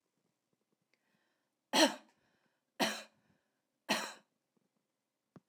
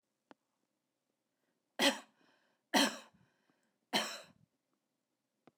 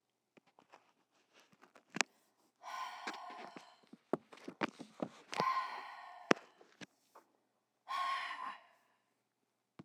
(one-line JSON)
{"three_cough_length": "5.5 s", "three_cough_amplitude": 7899, "three_cough_signal_mean_std_ratio": 0.23, "cough_length": "5.6 s", "cough_amplitude": 4875, "cough_signal_mean_std_ratio": 0.24, "exhalation_length": "9.8 s", "exhalation_amplitude": 14636, "exhalation_signal_mean_std_ratio": 0.33, "survey_phase": "beta (2021-08-13 to 2022-03-07)", "age": "45-64", "gender": "Female", "wearing_mask": "No", "symptom_other": true, "smoker_status": "Never smoked", "respiratory_condition_asthma": false, "respiratory_condition_other": false, "recruitment_source": "REACT", "submission_delay": "4 days", "covid_test_result": "Negative", "covid_test_method": "RT-qPCR"}